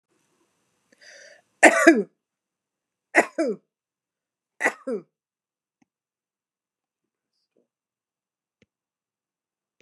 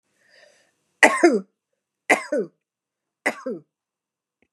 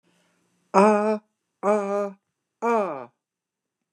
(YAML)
three_cough_length: 9.8 s
three_cough_amplitude: 29204
three_cough_signal_mean_std_ratio: 0.19
cough_length: 4.5 s
cough_amplitude: 29203
cough_signal_mean_std_ratio: 0.28
exhalation_length: 3.9 s
exhalation_amplitude: 25246
exhalation_signal_mean_std_ratio: 0.41
survey_phase: beta (2021-08-13 to 2022-03-07)
age: 65+
gender: Female
wearing_mask: 'No'
symptom_none: true
smoker_status: Never smoked
respiratory_condition_asthma: false
respiratory_condition_other: false
recruitment_source: REACT
submission_delay: 2 days
covid_test_result: Negative
covid_test_method: RT-qPCR
influenza_a_test_result: Negative
influenza_b_test_result: Negative